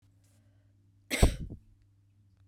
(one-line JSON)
{"cough_length": "2.5 s", "cough_amplitude": 14316, "cough_signal_mean_std_ratio": 0.24, "survey_phase": "beta (2021-08-13 to 2022-03-07)", "age": "45-64", "gender": "Female", "wearing_mask": "No", "symptom_runny_or_blocked_nose": true, "symptom_fatigue": true, "symptom_fever_high_temperature": true, "symptom_headache": true, "symptom_change_to_sense_of_smell_or_taste": true, "symptom_loss_of_taste": true, "symptom_onset": "2 days", "smoker_status": "Never smoked", "respiratory_condition_asthma": false, "respiratory_condition_other": false, "recruitment_source": "Test and Trace", "submission_delay": "2 days", "covid_test_result": "Positive", "covid_test_method": "RT-qPCR", "covid_ct_value": 21.5, "covid_ct_gene": "ORF1ab gene"}